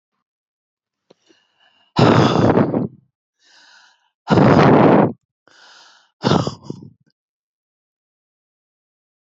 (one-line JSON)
{"exhalation_length": "9.4 s", "exhalation_amplitude": 28165, "exhalation_signal_mean_std_ratio": 0.37, "survey_phase": "beta (2021-08-13 to 2022-03-07)", "age": "65+", "gender": "Female", "wearing_mask": "No", "symptom_none": true, "smoker_status": "Never smoked", "respiratory_condition_asthma": false, "respiratory_condition_other": false, "recruitment_source": "REACT", "submission_delay": "2 days", "covid_test_result": "Negative", "covid_test_method": "RT-qPCR"}